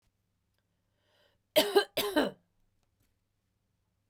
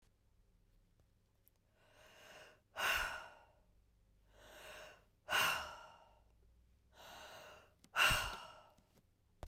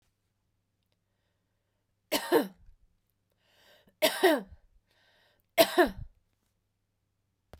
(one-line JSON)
{"cough_length": "4.1 s", "cough_amplitude": 9311, "cough_signal_mean_std_ratio": 0.26, "exhalation_length": "9.5 s", "exhalation_amplitude": 3622, "exhalation_signal_mean_std_ratio": 0.34, "three_cough_length": "7.6 s", "three_cough_amplitude": 17938, "three_cough_signal_mean_std_ratio": 0.25, "survey_phase": "beta (2021-08-13 to 2022-03-07)", "age": "45-64", "gender": "Female", "wearing_mask": "No", "symptom_cough_any": true, "symptom_runny_or_blocked_nose": true, "symptom_fatigue": true, "symptom_headache": true, "symptom_change_to_sense_of_smell_or_taste": true, "symptom_onset": "4 days", "smoker_status": "Ex-smoker", "respiratory_condition_asthma": false, "respiratory_condition_other": false, "recruitment_source": "Test and Trace", "submission_delay": "2 days", "covid_test_result": "Positive", "covid_test_method": "RT-qPCR", "covid_ct_value": 14.7, "covid_ct_gene": "ORF1ab gene", "covid_ct_mean": 14.9, "covid_viral_load": "13000000 copies/ml", "covid_viral_load_category": "High viral load (>1M copies/ml)"}